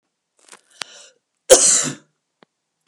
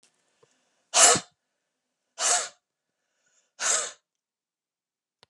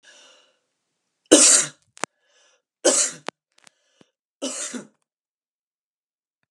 {"cough_length": "2.9 s", "cough_amplitude": 32768, "cough_signal_mean_std_ratio": 0.27, "exhalation_length": "5.3 s", "exhalation_amplitude": 29134, "exhalation_signal_mean_std_ratio": 0.27, "three_cough_length": "6.5 s", "three_cough_amplitude": 32768, "three_cough_signal_mean_std_ratio": 0.26, "survey_phase": "beta (2021-08-13 to 2022-03-07)", "age": "45-64", "gender": "Female", "wearing_mask": "No", "symptom_runny_or_blocked_nose": true, "symptom_fatigue": true, "symptom_headache": true, "smoker_status": "Never smoked", "respiratory_condition_asthma": false, "respiratory_condition_other": false, "recruitment_source": "Test and Trace", "submission_delay": "2 days", "covid_test_result": "Positive", "covid_test_method": "RT-qPCR", "covid_ct_value": 23.3, "covid_ct_gene": "ORF1ab gene", "covid_ct_mean": 23.8, "covid_viral_load": "16000 copies/ml", "covid_viral_load_category": "Low viral load (10K-1M copies/ml)"}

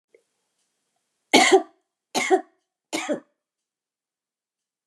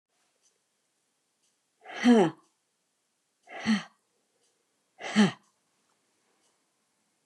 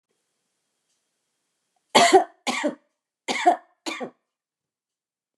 {"three_cough_length": "4.9 s", "three_cough_amplitude": 28682, "three_cough_signal_mean_std_ratio": 0.27, "exhalation_length": "7.3 s", "exhalation_amplitude": 11466, "exhalation_signal_mean_std_ratio": 0.24, "cough_length": "5.4 s", "cough_amplitude": 29725, "cough_signal_mean_std_ratio": 0.28, "survey_phase": "beta (2021-08-13 to 2022-03-07)", "age": "65+", "gender": "Female", "wearing_mask": "No", "symptom_none": true, "smoker_status": "Never smoked", "respiratory_condition_asthma": false, "respiratory_condition_other": false, "recruitment_source": "REACT", "submission_delay": "9 days", "covid_test_result": "Negative", "covid_test_method": "RT-qPCR", "influenza_a_test_result": "Negative", "influenza_b_test_result": "Negative"}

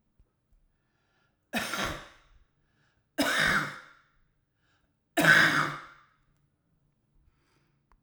{"three_cough_length": "8.0 s", "three_cough_amplitude": 16155, "three_cough_signal_mean_std_ratio": 0.32, "survey_phase": "alpha (2021-03-01 to 2021-08-12)", "age": "65+", "gender": "Male", "wearing_mask": "No", "symptom_cough_any": true, "symptom_fatigue": true, "symptom_change_to_sense_of_smell_or_taste": true, "symptom_loss_of_taste": true, "symptom_onset": "5 days", "smoker_status": "Ex-smoker", "respiratory_condition_asthma": false, "respiratory_condition_other": false, "recruitment_source": "Test and Trace", "submission_delay": "1 day", "covid_test_result": "Positive", "covid_test_method": "RT-qPCR"}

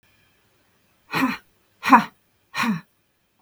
{"exhalation_length": "3.4 s", "exhalation_amplitude": 32534, "exhalation_signal_mean_std_ratio": 0.3, "survey_phase": "beta (2021-08-13 to 2022-03-07)", "age": "45-64", "gender": "Female", "wearing_mask": "No", "symptom_none": true, "smoker_status": "Never smoked", "respiratory_condition_asthma": false, "respiratory_condition_other": false, "recruitment_source": "REACT", "submission_delay": "2 days", "covid_test_result": "Negative", "covid_test_method": "RT-qPCR", "influenza_a_test_result": "Negative", "influenza_b_test_result": "Negative"}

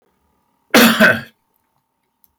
{"cough_length": "2.4 s", "cough_amplitude": 30291, "cough_signal_mean_std_ratio": 0.35, "survey_phase": "alpha (2021-03-01 to 2021-08-12)", "age": "65+", "gender": "Male", "wearing_mask": "No", "symptom_none": true, "smoker_status": "Ex-smoker", "respiratory_condition_asthma": false, "respiratory_condition_other": false, "recruitment_source": "REACT", "submission_delay": "1 day", "covid_test_result": "Negative", "covid_test_method": "RT-qPCR"}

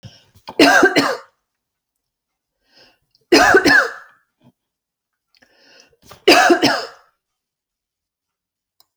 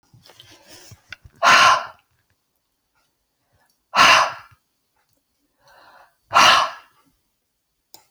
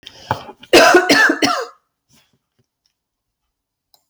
{"three_cough_length": "9.0 s", "three_cough_amplitude": 32584, "three_cough_signal_mean_std_ratio": 0.34, "exhalation_length": "8.1 s", "exhalation_amplitude": 32093, "exhalation_signal_mean_std_ratio": 0.3, "cough_length": "4.1 s", "cough_amplitude": 32767, "cough_signal_mean_std_ratio": 0.37, "survey_phase": "alpha (2021-03-01 to 2021-08-12)", "age": "45-64", "gender": "Female", "wearing_mask": "No", "symptom_none": true, "smoker_status": "Never smoked", "respiratory_condition_asthma": false, "respiratory_condition_other": false, "recruitment_source": "REACT", "submission_delay": "2 days", "covid_test_result": "Negative", "covid_test_method": "RT-qPCR"}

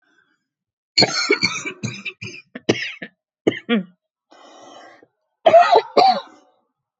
{"cough_length": "7.0 s", "cough_amplitude": 28222, "cough_signal_mean_std_ratio": 0.37, "survey_phase": "beta (2021-08-13 to 2022-03-07)", "age": "18-44", "gender": "Female", "wearing_mask": "No", "symptom_cough_any": true, "symptom_shortness_of_breath": true, "symptom_change_to_sense_of_smell_or_taste": true, "smoker_status": "Never smoked", "respiratory_condition_asthma": false, "respiratory_condition_other": false, "recruitment_source": "REACT", "submission_delay": "1 day", "covid_test_result": "Negative", "covid_test_method": "RT-qPCR", "influenza_a_test_result": "Negative", "influenza_b_test_result": "Negative"}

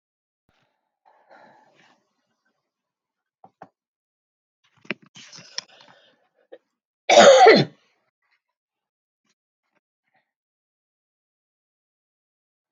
{"cough_length": "12.7 s", "cough_amplitude": 27724, "cough_signal_mean_std_ratio": 0.18, "survey_phase": "alpha (2021-03-01 to 2021-08-12)", "age": "65+", "gender": "Female", "wearing_mask": "No", "symptom_none": true, "smoker_status": "Never smoked", "respiratory_condition_asthma": false, "respiratory_condition_other": false, "recruitment_source": "REACT", "submission_delay": "3 days", "covid_test_result": "Negative", "covid_test_method": "RT-qPCR"}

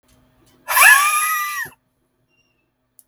{"exhalation_length": "3.1 s", "exhalation_amplitude": 32768, "exhalation_signal_mean_std_ratio": 0.41, "survey_phase": "beta (2021-08-13 to 2022-03-07)", "age": "18-44", "gender": "Male", "wearing_mask": "No", "symptom_diarrhoea": true, "symptom_fatigue": true, "smoker_status": "Never smoked", "respiratory_condition_asthma": false, "respiratory_condition_other": false, "recruitment_source": "REACT", "submission_delay": "1 day", "covid_test_result": "Negative", "covid_test_method": "RT-qPCR"}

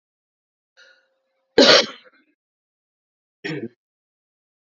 {"cough_length": "4.7 s", "cough_amplitude": 31243, "cough_signal_mean_std_ratio": 0.21, "survey_phase": "beta (2021-08-13 to 2022-03-07)", "age": "45-64", "gender": "Female", "wearing_mask": "No", "symptom_cough_any": true, "symptom_runny_or_blocked_nose": true, "symptom_sore_throat": true, "symptom_fatigue": true, "symptom_fever_high_temperature": true, "symptom_headache": true, "symptom_change_to_sense_of_smell_or_taste": true, "symptom_loss_of_taste": true, "symptom_onset": "6 days", "smoker_status": "Never smoked", "respiratory_condition_asthma": false, "respiratory_condition_other": false, "recruitment_source": "Test and Trace", "submission_delay": "2 days", "covid_test_result": "Positive", "covid_test_method": "RT-qPCR", "covid_ct_value": 16.3, "covid_ct_gene": "ORF1ab gene"}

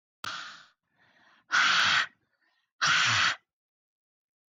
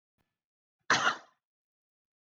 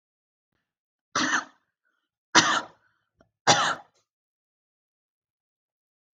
{"exhalation_length": "4.5 s", "exhalation_amplitude": 8033, "exhalation_signal_mean_std_ratio": 0.44, "cough_length": "2.3 s", "cough_amplitude": 8241, "cough_signal_mean_std_ratio": 0.25, "three_cough_length": "6.1 s", "three_cough_amplitude": 19719, "three_cough_signal_mean_std_ratio": 0.27, "survey_phase": "beta (2021-08-13 to 2022-03-07)", "age": "18-44", "gender": "Female", "wearing_mask": "No", "symptom_diarrhoea": true, "symptom_fatigue": true, "smoker_status": "Never smoked", "respiratory_condition_asthma": false, "respiratory_condition_other": false, "recruitment_source": "REACT", "submission_delay": "2 days", "covid_test_result": "Negative", "covid_test_method": "RT-qPCR", "influenza_a_test_result": "Negative", "influenza_b_test_result": "Negative"}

